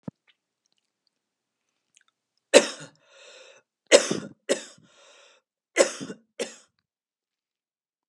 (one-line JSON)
{"three_cough_length": "8.1 s", "three_cough_amplitude": 30935, "three_cough_signal_mean_std_ratio": 0.19, "survey_phase": "beta (2021-08-13 to 2022-03-07)", "age": "45-64", "gender": "Female", "wearing_mask": "No", "symptom_fatigue": true, "smoker_status": "Current smoker (e-cigarettes or vapes only)", "respiratory_condition_asthma": false, "respiratory_condition_other": false, "recruitment_source": "REACT", "submission_delay": "1 day", "covid_test_result": "Negative", "covid_test_method": "RT-qPCR", "influenza_a_test_result": "Negative", "influenza_b_test_result": "Negative"}